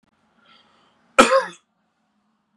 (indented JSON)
{
  "cough_length": "2.6 s",
  "cough_amplitude": 32768,
  "cough_signal_mean_std_ratio": 0.23,
  "survey_phase": "beta (2021-08-13 to 2022-03-07)",
  "age": "18-44",
  "gender": "Male",
  "wearing_mask": "No",
  "symptom_cough_any": true,
  "symptom_headache": true,
  "smoker_status": "Never smoked",
  "respiratory_condition_asthma": false,
  "respiratory_condition_other": false,
  "recruitment_source": "Test and Trace",
  "submission_delay": "2 days",
  "covid_test_result": "Positive",
  "covid_test_method": "RT-qPCR",
  "covid_ct_value": 20.2,
  "covid_ct_gene": "ORF1ab gene",
  "covid_ct_mean": 20.6,
  "covid_viral_load": "180000 copies/ml",
  "covid_viral_load_category": "Low viral load (10K-1M copies/ml)"
}